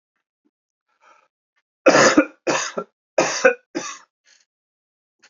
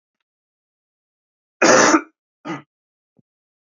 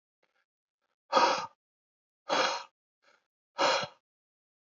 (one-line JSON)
{"three_cough_length": "5.3 s", "three_cough_amplitude": 28231, "three_cough_signal_mean_std_ratio": 0.32, "cough_length": "3.7 s", "cough_amplitude": 30147, "cough_signal_mean_std_ratio": 0.28, "exhalation_length": "4.7 s", "exhalation_amplitude": 9140, "exhalation_signal_mean_std_ratio": 0.34, "survey_phase": "beta (2021-08-13 to 2022-03-07)", "age": "18-44", "gender": "Male", "wearing_mask": "No", "symptom_cough_any": true, "symptom_runny_or_blocked_nose": true, "symptom_fatigue": true, "symptom_other": true, "symptom_onset": "2 days", "smoker_status": "Never smoked", "respiratory_condition_asthma": false, "respiratory_condition_other": false, "recruitment_source": "Test and Trace", "submission_delay": "1 day", "covid_test_result": "Positive", "covid_test_method": "RT-qPCR", "covid_ct_value": 20.3, "covid_ct_gene": "ORF1ab gene", "covid_ct_mean": 20.7, "covid_viral_load": "170000 copies/ml", "covid_viral_load_category": "Low viral load (10K-1M copies/ml)"}